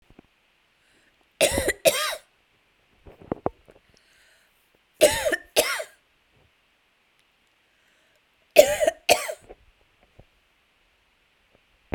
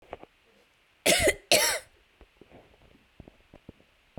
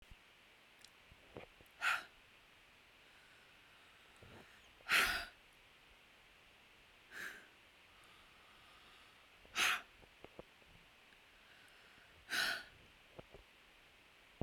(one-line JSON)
{"three_cough_length": "11.9 s", "three_cough_amplitude": 32768, "three_cough_signal_mean_std_ratio": 0.26, "cough_length": "4.2 s", "cough_amplitude": 17127, "cough_signal_mean_std_ratio": 0.31, "exhalation_length": "14.4 s", "exhalation_amplitude": 3647, "exhalation_signal_mean_std_ratio": 0.33, "survey_phase": "beta (2021-08-13 to 2022-03-07)", "age": "18-44", "gender": "Female", "wearing_mask": "No", "symptom_none": true, "smoker_status": "Never smoked", "respiratory_condition_asthma": false, "respiratory_condition_other": false, "recruitment_source": "REACT", "submission_delay": "1 day", "covid_test_result": "Negative", "covid_test_method": "RT-qPCR"}